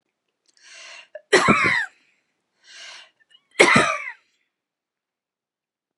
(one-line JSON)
{"cough_length": "6.0 s", "cough_amplitude": 32767, "cough_signal_mean_std_ratio": 0.32, "survey_phase": "alpha (2021-03-01 to 2021-08-12)", "age": "65+", "gender": "Female", "wearing_mask": "No", "symptom_none": true, "smoker_status": "Never smoked", "respiratory_condition_asthma": true, "respiratory_condition_other": false, "recruitment_source": "REACT", "submission_delay": "1 day", "covid_test_result": "Negative", "covid_test_method": "RT-qPCR"}